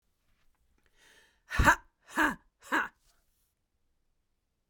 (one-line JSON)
{"exhalation_length": "4.7 s", "exhalation_amplitude": 11304, "exhalation_signal_mean_std_ratio": 0.26, "survey_phase": "beta (2021-08-13 to 2022-03-07)", "age": "18-44", "gender": "Female", "wearing_mask": "No", "symptom_cough_any": true, "symptom_new_continuous_cough": true, "symptom_runny_or_blocked_nose": true, "symptom_fatigue": true, "symptom_fever_high_temperature": true, "symptom_change_to_sense_of_smell_or_taste": true, "symptom_onset": "3 days", "smoker_status": "Never smoked", "respiratory_condition_asthma": true, "respiratory_condition_other": false, "recruitment_source": "Test and Trace", "submission_delay": "1 day", "covid_test_result": "Positive", "covid_test_method": "RT-qPCR", "covid_ct_value": 25.1, "covid_ct_gene": "ORF1ab gene", "covid_ct_mean": 28.9, "covid_viral_load": "320 copies/ml", "covid_viral_load_category": "Minimal viral load (< 10K copies/ml)"}